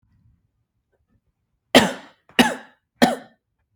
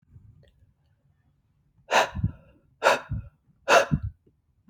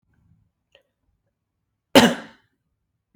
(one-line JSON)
{"three_cough_length": "3.8 s", "three_cough_amplitude": 32768, "three_cough_signal_mean_std_ratio": 0.24, "exhalation_length": "4.7 s", "exhalation_amplitude": 21400, "exhalation_signal_mean_std_ratio": 0.32, "cough_length": "3.2 s", "cough_amplitude": 32768, "cough_signal_mean_std_ratio": 0.18, "survey_phase": "beta (2021-08-13 to 2022-03-07)", "age": "18-44", "gender": "Male", "wearing_mask": "No", "symptom_none": true, "smoker_status": "Never smoked", "respiratory_condition_asthma": false, "respiratory_condition_other": false, "recruitment_source": "REACT", "submission_delay": "1 day", "covid_test_result": "Negative", "covid_test_method": "RT-qPCR", "influenza_a_test_result": "Negative", "influenza_b_test_result": "Negative"}